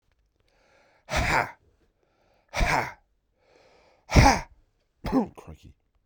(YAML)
exhalation_length: 6.1 s
exhalation_amplitude: 20027
exhalation_signal_mean_std_ratio: 0.33
survey_phase: beta (2021-08-13 to 2022-03-07)
age: 45-64
gender: Male
wearing_mask: 'No'
symptom_cough_any: true
symptom_fatigue: true
symptom_fever_high_temperature: true
symptom_headache: true
symptom_change_to_sense_of_smell_or_taste: true
symptom_onset: 3 days
smoker_status: Never smoked
respiratory_condition_asthma: false
respiratory_condition_other: false
recruitment_source: Test and Trace
submission_delay: 2 days
covid_test_result: Positive
covid_test_method: RT-qPCR
covid_ct_value: 24.9
covid_ct_gene: ORF1ab gene